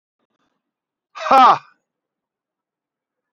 {
  "exhalation_length": "3.3 s",
  "exhalation_amplitude": 27325,
  "exhalation_signal_mean_std_ratio": 0.24,
  "survey_phase": "beta (2021-08-13 to 2022-03-07)",
  "age": "45-64",
  "gender": "Male",
  "wearing_mask": "No",
  "symptom_none": true,
  "smoker_status": "Never smoked",
  "respiratory_condition_asthma": false,
  "respiratory_condition_other": false,
  "recruitment_source": "REACT",
  "submission_delay": "1 day",
  "covid_test_result": "Negative",
  "covid_test_method": "RT-qPCR",
  "influenza_a_test_result": "Unknown/Void",
  "influenza_b_test_result": "Unknown/Void"
}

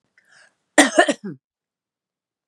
{
  "cough_length": "2.5 s",
  "cough_amplitude": 32768,
  "cough_signal_mean_std_ratio": 0.25,
  "survey_phase": "beta (2021-08-13 to 2022-03-07)",
  "age": "45-64",
  "gender": "Female",
  "wearing_mask": "No",
  "symptom_abdominal_pain": true,
  "symptom_diarrhoea": true,
  "symptom_fatigue": true,
  "symptom_onset": "4 days",
  "smoker_status": "Ex-smoker",
  "respiratory_condition_asthma": true,
  "respiratory_condition_other": false,
  "recruitment_source": "REACT",
  "submission_delay": "2 days",
  "covid_test_result": "Negative",
  "covid_test_method": "RT-qPCR",
  "influenza_a_test_result": "Unknown/Void",
  "influenza_b_test_result": "Unknown/Void"
}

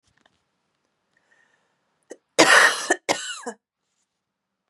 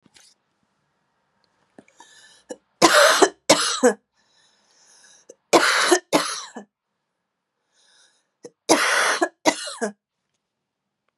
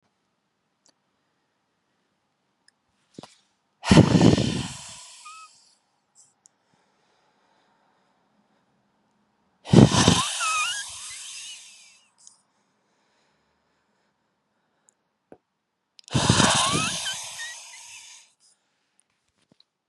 {
  "cough_length": "4.7 s",
  "cough_amplitude": 32312,
  "cough_signal_mean_std_ratio": 0.27,
  "three_cough_length": "11.2 s",
  "three_cough_amplitude": 32767,
  "three_cough_signal_mean_std_ratio": 0.34,
  "exhalation_length": "19.9 s",
  "exhalation_amplitude": 32768,
  "exhalation_signal_mean_std_ratio": 0.27,
  "survey_phase": "beta (2021-08-13 to 2022-03-07)",
  "age": "18-44",
  "gender": "Female",
  "wearing_mask": "No",
  "symptom_cough_any": true,
  "symptom_new_continuous_cough": true,
  "symptom_runny_or_blocked_nose": true,
  "symptom_shortness_of_breath": true,
  "symptom_sore_throat": true,
  "symptom_diarrhoea": true,
  "symptom_fatigue": true,
  "symptom_headache": true,
  "symptom_change_to_sense_of_smell_or_taste": true,
  "symptom_onset": "2 days",
  "smoker_status": "Ex-smoker",
  "respiratory_condition_asthma": false,
  "respiratory_condition_other": false,
  "recruitment_source": "Test and Trace",
  "submission_delay": "2 days",
  "covid_test_result": "Positive",
  "covid_test_method": "ePCR"
}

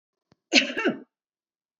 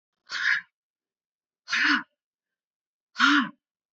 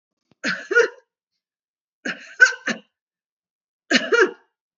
{
  "cough_length": "1.8 s",
  "cough_amplitude": 26239,
  "cough_signal_mean_std_ratio": 0.32,
  "exhalation_length": "3.9 s",
  "exhalation_amplitude": 13909,
  "exhalation_signal_mean_std_ratio": 0.37,
  "three_cough_length": "4.8 s",
  "three_cough_amplitude": 29336,
  "three_cough_signal_mean_std_ratio": 0.32,
  "survey_phase": "beta (2021-08-13 to 2022-03-07)",
  "age": "65+",
  "gender": "Female",
  "wearing_mask": "No",
  "symptom_none": true,
  "smoker_status": "Never smoked",
  "respiratory_condition_asthma": false,
  "respiratory_condition_other": false,
  "recruitment_source": "REACT",
  "submission_delay": "2 days",
  "covid_test_result": "Negative",
  "covid_test_method": "RT-qPCR",
  "influenza_a_test_result": "Negative",
  "influenza_b_test_result": "Negative"
}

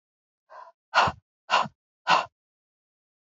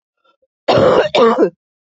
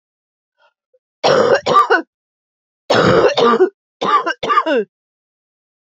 {
  "exhalation_length": "3.2 s",
  "exhalation_amplitude": 15337,
  "exhalation_signal_mean_std_ratio": 0.31,
  "cough_length": "1.9 s",
  "cough_amplitude": 31101,
  "cough_signal_mean_std_ratio": 0.58,
  "three_cough_length": "5.8 s",
  "three_cough_amplitude": 32165,
  "three_cough_signal_mean_std_ratio": 0.52,
  "survey_phase": "beta (2021-08-13 to 2022-03-07)",
  "age": "18-44",
  "gender": "Female",
  "wearing_mask": "No",
  "symptom_new_continuous_cough": true,
  "symptom_shortness_of_breath": true,
  "symptom_fatigue": true,
  "symptom_onset": "6 days",
  "smoker_status": "Never smoked",
  "respiratory_condition_asthma": false,
  "respiratory_condition_other": false,
  "recruitment_source": "Test and Trace",
  "submission_delay": "2 days",
  "covid_test_result": "Positive",
  "covid_test_method": "RT-qPCR"
}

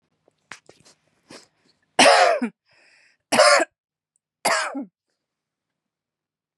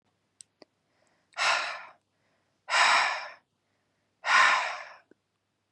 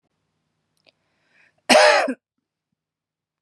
{
  "three_cough_length": "6.6 s",
  "three_cough_amplitude": 28812,
  "three_cough_signal_mean_std_ratio": 0.32,
  "exhalation_length": "5.7 s",
  "exhalation_amplitude": 11924,
  "exhalation_signal_mean_std_ratio": 0.39,
  "cough_length": "3.4 s",
  "cough_amplitude": 30474,
  "cough_signal_mean_std_ratio": 0.28,
  "survey_phase": "beta (2021-08-13 to 2022-03-07)",
  "age": "18-44",
  "gender": "Female",
  "wearing_mask": "No",
  "symptom_none": true,
  "symptom_onset": "5 days",
  "smoker_status": "Never smoked",
  "respiratory_condition_asthma": false,
  "respiratory_condition_other": false,
  "recruitment_source": "REACT",
  "submission_delay": "1 day",
  "covid_test_result": "Negative",
  "covid_test_method": "RT-qPCR",
  "influenza_a_test_result": "Negative",
  "influenza_b_test_result": "Negative"
}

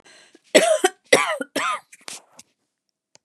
{
  "three_cough_length": "3.2 s",
  "three_cough_amplitude": 32240,
  "three_cough_signal_mean_std_ratio": 0.36,
  "survey_phase": "beta (2021-08-13 to 2022-03-07)",
  "age": "65+",
  "gender": "Female",
  "wearing_mask": "No",
  "symptom_cough_any": true,
  "smoker_status": "Never smoked",
  "respiratory_condition_asthma": false,
  "respiratory_condition_other": false,
  "recruitment_source": "REACT",
  "submission_delay": "1 day",
  "covid_test_result": "Negative",
  "covid_test_method": "RT-qPCR",
  "influenza_a_test_result": "Unknown/Void",
  "influenza_b_test_result": "Unknown/Void"
}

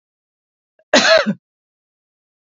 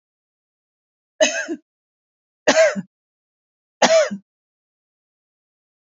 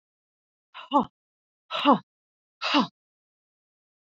{
  "cough_length": "2.5 s",
  "cough_amplitude": 32767,
  "cough_signal_mean_std_ratio": 0.31,
  "three_cough_length": "6.0 s",
  "three_cough_amplitude": 30191,
  "three_cough_signal_mean_std_ratio": 0.29,
  "exhalation_length": "4.1 s",
  "exhalation_amplitude": 17563,
  "exhalation_signal_mean_std_ratio": 0.28,
  "survey_phase": "beta (2021-08-13 to 2022-03-07)",
  "age": "45-64",
  "gender": "Female",
  "wearing_mask": "No",
  "symptom_none": true,
  "smoker_status": "Never smoked",
  "respiratory_condition_asthma": false,
  "respiratory_condition_other": false,
  "recruitment_source": "REACT",
  "submission_delay": "3 days",
  "covid_test_result": "Negative",
  "covid_test_method": "RT-qPCR"
}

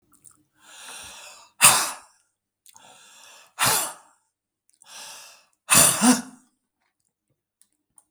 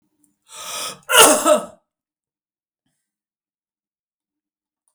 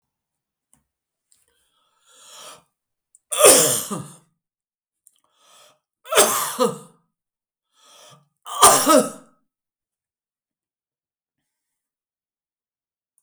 {
  "exhalation_length": "8.1 s",
  "exhalation_amplitude": 32768,
  "exhalation_signal_mean_std_ratio": 0.29,
  "cough_length": "4.9 s",
  "cough_amplitude": 32768,
  "cough_signal_mean_std_ratio": 0.27,
  "three_cough_length": "13.2 s",
  "three_cough_amplitude": 32768,
  "three_cough_signal_mean_std_ratio": 0.26,
  "survey_phase": "beta (2021-08-13 to 2022-03-07)",
  "age": "65+",
  "gender": "Male",
  "wearing_mask": "No",
  "symptom_cough_any": true,
  "symptom_fatigue": true,
  "symptom_onset": "12 days",
  "smoker_status": "Never smoked",
  "respiratory_condition_asthma": false,
  "respiratory_condition_other": true,
  "recruitment_source": "REACT",
  "submission_delay": "2 days",
  "covid_test_result": "Negative",
  "covid_test_method": "RT-qPCR"
}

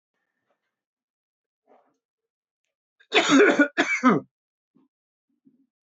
{
  "cough_length": "5.9 s",
  "cough_amplitude": 17188,
  "cough_signal_mean_std_ratio": 0.3,
  "survey_phase": "beta (2021-08-13 to 2022-03-07)",
  "age": "45-64",
  "gender": "Male",
  "wearing_mask": "No",
  "symptom_cough_any": true,
  "symptom_runny_or_blocked_nose": true,
  "symptom_other": true,
  "symptom_onset": "6 days",
  "smoker_status": "Never smoked",
  "respiratory_condition_asthma": false,
  "respiratory_condition_other": false,
  "recruitment_source": "Test and Trace",
  "submission_delay": "2 days",
  "covid_test_result": "Positive",
  "covid_test_method": "RT-qPCR",
  "covid_ct_value": 20.5,
  "covid_ct_gene": "ORF1ab gene"
}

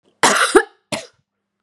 {
  "cough_length": "1.6 s",
  "cough_amplitude": 32767,
  "cough_signal_mean_std_ratio": 0.39,
  "survey_phase": "beta (2021-08-13 to 2022-03-07)",
  "age": "18-44",
  "gender": "Female",
  "wearing_mask": "No",
  "symptom_cough_any": true,
  "symptom_runny_or_blocked_nose": true,
  "symptom_headache": true,
  "symptom_onset": "5 days",
  "smoker_status": "Never smoked",
  "respiratory_condition_asthma": false,
  "respiratory_condition_other": false,
  "recruitment_source": "Test and Trace",
  "submission_delay": "2 days",
  "covid_test_result": "Positive",
  "covid_test_method": "RT-qPCR",
  "covid_ct_value": 25.2,
  "covid_ct_gene": "N gene"
}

